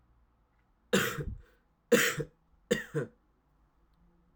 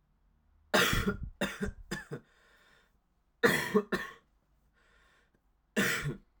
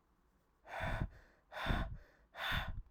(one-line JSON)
{"three_cough_length": "4.4 s", "three_cough_amplitude": 9143, "three_cough_signal_mean_std_ratio": 0.34, "cough_length": "6.4 s", "cough_amplitude": 10625, "cough_signal_mean_std_ratio": 0.4, "exhalation_length": "2.9 s", "exhalation_amplitude": 2638, "exhalation_signal_mean_std_ratio": 0.57, "survey_phase": "alpha (2021-03-01 to 2021-08-12)", "age": "18-44", "gender": "Male", "wearing_mask": "No", "symptom_cough_any": true, "symptom_new_continuous_cough": true, "symptom_shortness_of_breath": true, "symptom_fatigue": true, "symptom_fever_high_temperature": true, "symptom_headache": true, "symptom_change_to_sense_of_smell_or_taste": true, "symptom_onset": "4 days", "smoker_status": "Never smoked", "respiratory_condition_asthma": false, "respiratory_condition_other": false, "recruitment_source": "Test and Trace", "submission_delay": "1 day", "covid_test_result": "Positive", "covid_test_method": "RT-qPCR", "covid_ct_value": 19.9, "covid_ct_gene": "ORF1ab gene"}